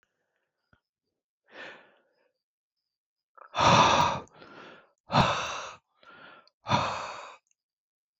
{
  "exhalation_length": "8.2 s",
  "exhalation_amplitude": 13717,
  "exhalation_signal_mean_std_ratio": 0.34,
  "survey_phase": "beta (2021-08-13 to 2022-03-07)",
  "age": "45-64",
  "gender": "Female",
  "wearing_mask": "No",
  "symptom_none": true,
  "smoker_status": "Never smoked",
  "respiratory_condition_asthma": false,
  "respiratory_condition_other": false,
  "recruitment_source": "REACT",
  "submission_delay": "1 day",
  "covid_test_result": "Negative",
  "covid_test_method": "RT-qPCR"
}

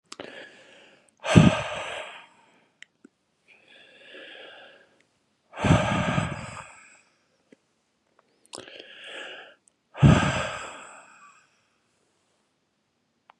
{
  "exhalation_length": "13.4 s",
  "exhalation_amplitude": 31976,
  "exhalation_signal_mean_std_ratio": 0.29,
  "survey_phase": "beta (2021-08-13 to 2022-03-07)",
  "age": "45-64",
  "gender": "Male",
  "wearing_mask": "No",
  "symptom_cough_any": true,
  "symptom_runny_or_blocked_nose": true,
  "symptom_fever_high_temperature": true,
  "symptom_headache": true,
  "smoker_status": "Never smoked",
  "respiratory_condition_asthma": true,
  "respiratory_condition_other": false,
  "recruitment_source": "Test and Trace",
  "submission_delay": "2 days",
  "covid_test_result": "Positive",
  "covid_test_method": "LFT"
}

